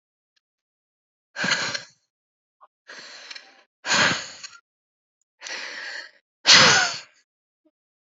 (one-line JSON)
{"exhalation_length": "8.1 s", "exhalation_amplitude": 32767, "exhalation_signal_mean_std_ratio": 0.31, "survey_phase": "alpha (2021-03-01 to 2021-08-12)", "age": "18-44", "gender": "Female", "wearing_mask": "No", "symptom_fatigue": true, "symptom_loss_of_taste": true, "symptom_onset": "3 days", "smoker_status": "Ex-smoker", "respiratory_condition_asthma": false, "respiratory_condition_other": false, "recruitment_source": "Test and Trace", "submission_delay": "2 days", "covid_test_result": "Positive", "covid_test_method": "RT-qPCR", "covid_ct_value": 20.8, "covid_ct_gene": "ORF1ab gene", "covid_ct_mean": 20.8, "covid_viral_load": "150000 copies/ml", "covid_viral_load_category": "Low viral load (10K-1M copies/ml)"}